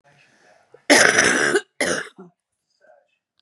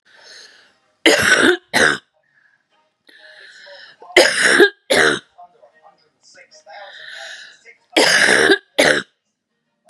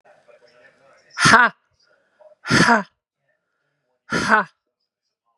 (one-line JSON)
{"cough_length": "3.4 s", "cough_amplitude": 32700, "cough_signal_mean_std_ratio": 0.4, "three_cough_length": "9.9 s", "three_cough_amplitude": 32768, "three_cough_signal_mean_std_ratio": 0.41, "exhalation_length": "5.4 s", "exhalation_amplitude": 32768, "exhalation_signal_mean_std_ratio": 0.32, "survey_phase": "beta (2021-08-13 to 2022-03-07)", "age": "45-64", "gender": "Female", "wearing_mask": "No", "symptom_cough_any": true, "symptom_runny_or_blocked_nose": true, "symptom_fatigue": true, "symptom_change_to_sense_of_smell_or_taste": true, "symptom_loss_of_taste": true, "symptom_onset": "6 days", "smoker_status": "Never smoked", "respiratory_condition_asthma": false, "respiratory_condition_other": false, "recruitment_source": "Test and Trace", "submission_delay": "2 days", "covid_test_result": "Positive", "covid_test_method": "RT-qPCR", "covid_ct_value": 16.6, "covid_ct_gene": "ORF1ab gene", "covid_ct_mean": 17.3, "covid_viral_load": "2100000 copies/ml", "covid_viral_load_category": "High viral load (>1M copies/ml)"}